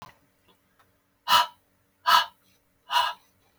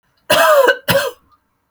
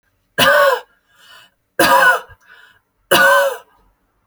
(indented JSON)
{
  "exhalation_length": "3.6 s",
  "exhalation_amplitude": 18682,
  "exhalation_signal_mean_std_ratio": 0.31,
  "cough_length": "1.7 s",
  "cough_amplitude": 32767,
  "cough_signal_mean_std_ratio": 0.55,
  "three_cough_length": "4.3 s",
  "three_cough_amplitude": 32413,
  "three_cough_signal_mean_std_ratio": 0.47,
  "survey_phase": "alpha (2021-03-01 to 2021-08-12)",
  "age": "18-44",
  "gender": "Female",
  "wearing_mask": "No",
  "symptom_none": true,
  "smoker_status": "Ex-smoker",
  "respiratory_condition_asthma": false,
  "respiratory_condition_other": false,
  "recruitment_source": "REACT",
  "submission_delay": "1 day",
  "covid_test_result": "Negative",
  "covid_test_method": "RT-qPCR"
}